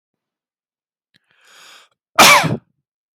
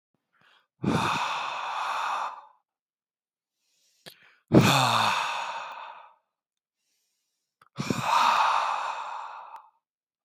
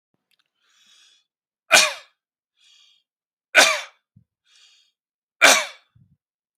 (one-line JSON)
{"cough_length": "3.2 s", "cough_amplitude": 32768, "cough_signal_mean_std_ratio": 0.28, "exhalation_length": "10.2 s", "exhalation_amplitude": 24247, "exhalation_signal_mean_std_ratio": 0.48, "three_cough_length": "6.6 s", "three_cough_amplitude": 30372, "three_cough_signal_mean_std_ratio": 0.24, "survey_phase": "beta (2021-08-13 to 2022-03-07)", "age": "18-44", "gender": "Male", "wearing_mask": "No", "symptom_other": true, "smoker_status": "Ex-smoker", "respiratory_condition_asthma": false, "respiratory_condition_other": false, "recruitment_source": "REACT", "submission_delay": "1 day", "covid_test_result": "Negative", "covid_test_method": "RT-qPCR", "influenza_a_test_result": "Negative", "influenza_b_test_result": "Negative"}